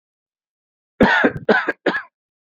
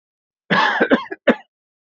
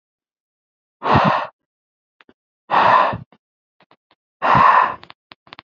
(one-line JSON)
{"three_cough_length": "2.6 s", "three_cough_amplitude": 27590, "three_cough_signal_mean_std_ratio": 0.4, "cough_length": "2.0 s", "cough_amplitude": 27307, "cough_signal_mean_std_ratio": 0.42, "exhalation_length": "5.6 s", "exhalation_amplitude": 27435, "exhalation_signal_mean_std_ratio": 0.4, "survey_phase": "alpha (2021-03-01 to 2021-08-12)", "age": "45-64", "gender": "Male", "wearing_mask": "No", "symptom_none": true, "smoker_status": "Never smoked", "respiratory_condition_asthma": false, "respiratory_condition_other": false, "recruitment_source": "REACT", "submission_delay": "1 day", "covid_test_result": "Negative", "covid_test_method": "RT-qPCR"}